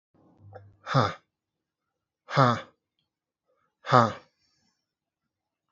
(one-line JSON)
{"exhalation_length": "5.7 s", "exhalation_amplitude": 25624, "exhalation_signal_mean_std_ratio": 0.24, "survey_phase": "alpha (2021-03-01 to 2021-08-12)", "age": "18-44", "gender": "Male", "wearing_mask": "No", "symptom_cough_any": true, "symptom_fatigue": true, "symptom_headache": true, "smoker_status": "Never smoked", "respiratory_condition_asthma": false, "respiratory_condition_other": false, "recruitment_source": "Test and Trace", "submission_delay": "37 days", "covid_test_result": "Negative", "covid_test_method": "RT-qPCR"}